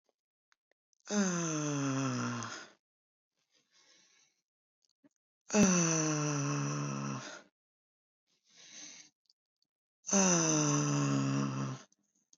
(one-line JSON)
{"exhalation_length": "12.4 s", "exhalation_amplitude": 6107, "exhalation_signal_mean_std_ratio": 0.54, "survey_phase": "beta (2021-08-13 to 2022-03-07)", "age": "65+", "gender": "Female", "wearing_mask": "No", "symptom_sore_throat": true, "symptom_onset": "3 days", "smoker_status": "Never smoked", "respiratory_condition_asthma": false, "respiratory_condition_other": false, "recruitment_source": "REACT", "submission_delay": "1 day", "covid_test_result": "Negative", "covid_test_method": "RT-qPCR", "influenza_a_test_result": "Negative", "influenza_b_test_result": "Negative"}